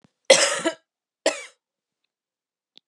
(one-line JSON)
{"cough_length": "2.9 s", "cough_amplitude": 31814, "cough_signal_mean_std_ratio": 0.27, "survey_phase": "beta (2021-08-13 to 2022-03-07)", "age": "45-64", "gender": "Female", "wearing_mask": "No", "symptom_cough_any": true, "symptom_runny_or_blocked_nose": true, "symptom_shortness_of_breath": true, "symptom_fatigue": true, "symptom_headache": true, "symptom_change_to_sense_of_smell_or_taste": true, "symptom_other": true, "symptom_onset": "7 days", "smoker_status": "Ex-smoker", "respiratory_condition_asthma": false, "respiratory_condition_other": false, "recruitment_source": "Test and Trace", "submission_delay": "1 day", "covid_test_result": "Positive", "covid_test_method": "RT-qPCR", "covid_ct_value": 24.9, "covid_ct_gene": "ORF1ab gene"}